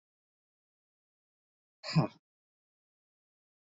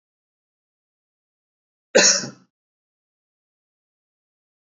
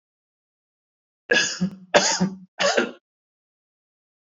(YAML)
exhalation_length: 3.8 s
exhalation_amplitude: 5719
exhalation_signal_mean_std_ratio: 0.16
cough_length: 4.8 s
cough_amplitude: 25305
cough_signal_mean_std_ratio: 0.18
three_cough_length: 4.3 s
three_cough_amplitude: 32140
three_cough_signal_mean_std_ratio: 0.37
survey_phase: alpha (2021-03-01 to 2021-08-12)
age: 45-64
gender: Male
wearing_mask: 'No'
symptom_cough_any: true
symptom_onset: 2 days
smoker_status: Ex-smoker
respiratory_condition_asthma: false
respiratory_condition_other: false
recruitment_source: REACT
submission_delay: 2 days
covid_test_result: Negative
covid_test_method: RT-qPCR